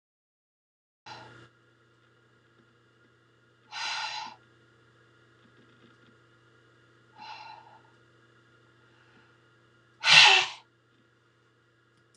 {"exhalation_length": "12.2 s", "exhalation_amplitude": 23083, "exhalation_signal_mean_std_ratio": 0.2, "survey_phase": "beta (2021-08-13 to 2022-03-07)", "age": "65+", "gender": "Female", "wearing_mask": "No", "symptom_none": true, "smoker_status": "Never smoked", "respiratory_condition_asthma": false, "respiratory_condition_other": false, "recruitment_source": "REACT", "submission_delay": "3 days", "covid_test_result": "Negative", "covid_test_method": "RT-qPCR"}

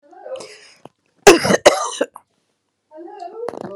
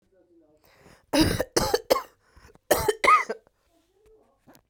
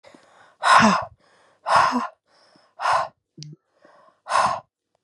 {"cough_length": "3.8 s", "cough_amplitude": 32768, "cough_signal_mean_std_ratio": 0.31, "three_cough_length": "4.7 s", "three_cough_amplitude": 19839, "three_cough_signal_mean_std_ratio": 0.37, "exhalation_length": "5.0 s", "exhalation_amplitude": 24295, "exhalation_signal_mean_std_ratio": 0.42, "survey_phase": "beta (2021-08-13 to 2022-03-07)", "age": "18-44", "gender": "Female", "wearing_mask": "No", "symptom_cough_any": true, "symptom_fatigue": true, "symptom_onset": "9 days", "smoker_status": "Never smoked", "respiratory_condition_asthma": false, "respiratory_condition_other": false, "recruitment_source": "REACT", "submission_delay": "0 days", "covid_test_result": "Negative", "covid_test_method": "RT-qPCR"}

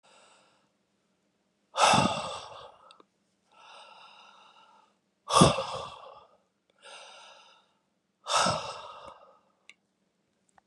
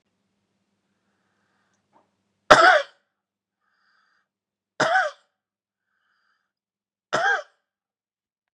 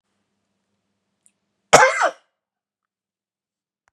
{"exhalation_length": "10.7 s", "exhalation_amplitude": 20630, "exhalation_signal_mean_std_ratio": 0.29, "three_cough_length": "8.5 s", "three_cough_amplitude": 32768, "three_cough_signal_mean_std_ratio": 0.23, "cough_length": "3.9 s", "cough_amplitude": 32768, "cough_signal_mean_std_ratio": 0.21, "survey_phase": "beta (2021-08-13 to 2022-03-07)", "age": "45-64", "gender": "Male", "wearing_mask": "No", "symptom_cough_any": true, "symptom_runny_or_blocked_nose": true, "symptom_change_to_sense_of_smell_or_taste": true, "smoker_status": "Ex-smoker", "respiratory_condition_asthma": false, "respiratory_condition_other": false, "recruitment_source": "Test and Trace", "submission_delay": "2 days", "covid_test_result": "Positive", "covid_test_method": "RT-qPCR"}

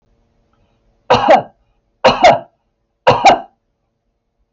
{"three_cough_length": "4.5 s", "three_cough_amplitude": 32359, "three_cough_signal_mean_std_ratio": 0.37, "survey_phase": "beta (2021-08-13 to 2022-03-07)", "age": "45-64", "gender": "Female", "wearing_mask": "No", "symptom_runny_or_blocked_nose": true, "symptom_onset": "12 days", "smoker_status": "Ex-smoker", "respiratory_condition_asthma": false, "respiratory_condition_other": false, "recruitment_source": "REACT", "submission_delay": "1 day", "covid_test_result": "Negative", "covid_test_method": "RT-qPCR"}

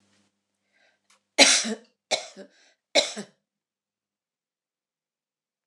{"three_cough_length": "5.7 s", "three_cough_amplitude": 26027, "three_cough_signal_mean_std_ratio": 0.23, "survey_phase": "beta (2021-08-13 to 2022-03-07)", "age": "65+", "gender": "Female", "wearing_mask": "No", "symptom_none": true, "smoker_status": "Never smoked", "respiratory_condition_asthma": false, "respiratory_condition_other": false, "recruitment_source": "REACT", "submission_delay": "1 day", "covid_test_result": "Negative", "covid_test_method": "RT-qPCR"}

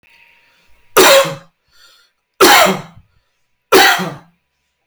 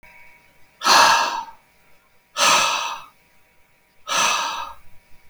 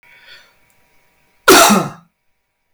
{"three_cough_length": "4.9 s", "three_cough_amplitude": 32768, "three_cough_signal_mean_std_ratio": 0.41, "exhalation_length": "5.3 s", "exhalation_amplitude": 27143, "exhalation_signal_mean_std_ratio": 0.47, "cough_length": "2.7 s", "cough_amplitude": 32768, "cough_signal_mean_std_ratio": 0.33, "survey_phase": "beta (2021-08-13 to 2022-03-07)", "age": "45-64", "gender": "Male", "wearing_mask": "No", "symptom_none": true, "smoker_status": "Never smoked", "respiratory_condition_asthma": false, "respiratory_condition_other": false, "recruitment_source": "REACT", "submission_delay": "1 day", "covid_test_result": "Negative", "covid_test_method": "RT-qPCR"}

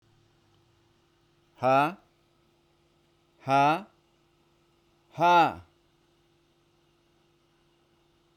{"exhalation_length": "8.4 s", "exhalation_amplitude": 10886, "exhalation_signal_mean_std_ratio": 0.28, "survey_phase": "beta (2021-08-13 to 2022-03-07)", "age": "45-64", "gender": "Male", "wearing_mask": "No", "symptom_none": true, "smoker_status": "Never smoked", "respiratory_condition_asthma": false, "respiratory_condition_other": false, "recruitment_source": "REACT", "submission_delay": "10 days", "covid_test_result": "Negative", "covid_test_method": "RT-qPCR"}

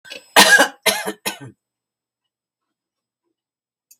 {"cough_length": "4.0 s", "cough_amplitude": 32768, "cough_signal_mean_std_ratio": 0.28, "survey_phase": "beta (2021-08-13 to 2022-03-07)", "age": "65+", "gender": "Female", "wearing_mask": "No", "symptom_none": true, "smoker_status": "Ex-smoker", "respiratory_condition_asthma": false, "respiratory_condition_other": false, "recruitment_source": "REACT", "submission_delay": "1 day", "covid_test_result": "Negative", "covid_test_method": "RT-qPCR", "influenza_a_test_result": "Negative", "influenza_b_test_result": "Negative"}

